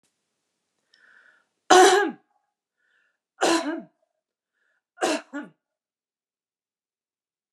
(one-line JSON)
{"three_cough_length": "7.5 s", "three_cough_amplitude": 32007, "three_cough_signal_mean_std_ratio": 0.25, "survey_phase": "beta (2021-08-13 to 2022-03-07)", "age": "45-64", "gender": "Female", "wearing_mask": "No", "symptom_none": true, "smoker_status": "Never smoked", "respiratory_condition_asthma": false, "respiratory_condition_other": false, "recruitment_source": "Test and Trace", "submission_delay": "-1 day", "covid_test_result": "Negative", "covid_test_method": "LFT"}